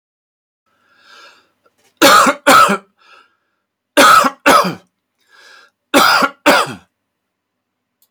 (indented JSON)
{
  "three_cough_length": "8.1 s",
  "three_cough_amplitude": 32768,
  "three_cough_signal_mean_std_ratio": 0.4,
  "survey_phase": "beta (2021-08-13 to 2022-03-07)",
  "age": "45-64",
  "gender": "Male",
  "wearing_mask": "No",
  "symptom_none": true,
  "smoker_status": "Never smoked",
  "respiratory_condition_asthma": false,
  "respiratory_condition_other": false,
  "recruitment_source": "Test and Trace",
  "submission_delay": "0 days",
  "covid_test_result": "Negative",
  "covid_test_method": "LFT"
}